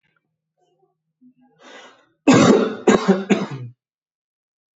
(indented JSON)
{
  "three_cough_length": "4.8 s",
  "three_cough_amplitude": 27594,
  "three_cough_signal_mean_std_ratio": 0.35,
  "survey_phase": "alpha (2021-03-01 to 2021-08-12)",
  "age": "18-44",
  "gender": "Male",
  "wearing_mask": "Yes",
  "symptom_none": true,
  "smoker_status": "Ex-smoker",
  "respiratory_condition_asthma": false,
  "respiratory_condition_other": false,
  "recruitment_source": "REACT",
  "submission_delay": "3 days",
  "covid_test_result": "Negative",
  "covid_test_method": "RT-qPCR"
}